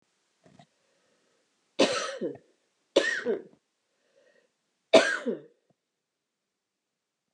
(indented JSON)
{
  "three_cough_length": "7.3 s",
  "three_cough_amplitude": 21301,
  "three_cough_signal_mean_std_ratio": 0.27,
  "survey_phase": "beta (2021-08-13 to 2022-03-07)",
  "age": "45-64",
  "gender": "Female",
  "wearing_mask": "No",
  "symptom_cough_any": true,
  "symptom_shortness_of_breath": true,
  "symptom_sore_throat": true,
  "symptom_fever_high_temperature": true,
  "symptom_change_to_sense_of_smell_or_taste": true,
  "symptom_loss_of_taste": true,
  "symptom_onset": "3 days",
  "smoker_status": "Never smoked",
  "respiratory_condition_asthma": true,
  "respiratory_condition_other": false,
  "recruitment_source": "Test and Trace",
  "submission_delay": "1 day",
  "covid_test_result": "Positive",
  "covid_test_method": "LAMP"
}